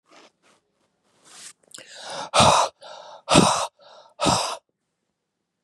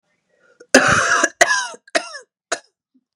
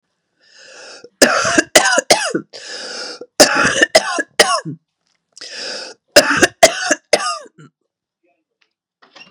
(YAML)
exhalation_length: 5.6 s
exhalation_amplitude: 29717
exhalation_signal_mean_std_ratio: 0.36
cough_length: 3.2 s
cough_amplitude: 32768
cough_signal_mean_std_ratio: 0.41
three_cough_length: 9.3 s
three_cough_amplitude: 32768
three_cough_signal_mean_std_ratio: 0.41
survey_phase: beta (2021-08-13 to 2022-03-07)
age: 45-64
gender: Female
wearing_mask: 'No'
symptom_cough_any: true
symptom_runny_or_blocked_nose: true
symptom_diarrhoea: true
symptom_fatigue: true
symptom_headache: true
symptom_change_to_sense_of_smell_or_taste: true
symptom_onset: 3 days
smoker_status: Never smoked
respiratory_condition_asthma: false
respiratory_condition_other: false
recruitment_source: Test and Trace
submission_delay: 1 day
covid_test_result: Positive
covid_test_method: RT-qPCR
covid_ct_value: 18.1
covid_ct_gene: ORF1ab gene
covid_ct_mean: 18.4
covid_viral_load: 910000 copies/ml
covid_viral_load_category: Low viral load (10K-1M copies/ml)